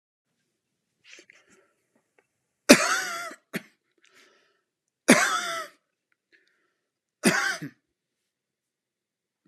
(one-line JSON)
{"three_cough_length": "9.5 s", "three_cough_amplitude": 32767, "three_cough_signal_mean_std_ratio": 0.24, "survey_phase": "beta (2021-08-13 to 2022-03-07)", "age": "45-64", "gender": "Male", "wearing_mask": "No", "symptom_none": true, "smoker_status": "Ex-smoker", "respiratory_condition_asthma": false, "respiratory_condition_other": false, "recruitment_source": "REACT", "submission_delay": "1 day", "covid_test_result": "Negative", "covid_test_method": "RT-qPCR"}